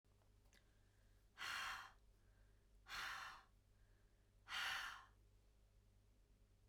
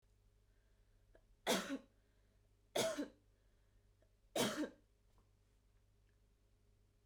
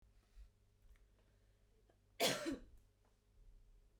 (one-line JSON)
{"exhalation_length": "6.7 s", "exhalation_amplitude": 608, "exhalation_signal_mean_std_ratio": 0.49, "three_cough_length": "7.1 s", "three_cough_amplitude": 2234, "three_cough_signal_mean_std_ratio": 0.32, "cough_length": "4.0 s", "cough_amplitude": 2232, "cough_signal_mean_std_ratio": 0.31, "survey_phase": "beta (2021-08-13 to 2022-03-07)", "age": "18-44", "gender": "Female", "wearing_mask": "No", "symptom_sore_throat": true, "symptom_onset": "13 days", "smoker_status": "Ex-smoker", "respiratory_condition_asthma": false, "respiratory_condition_other": false, "recruitment_source": "REACT", "submission_delay": "2 days", "covid_test_result": "Negative", "covid_test_method": "RT-qPCR", "influenza_a_test_result": "Negative", "influenza_b_test_result": "Negative"}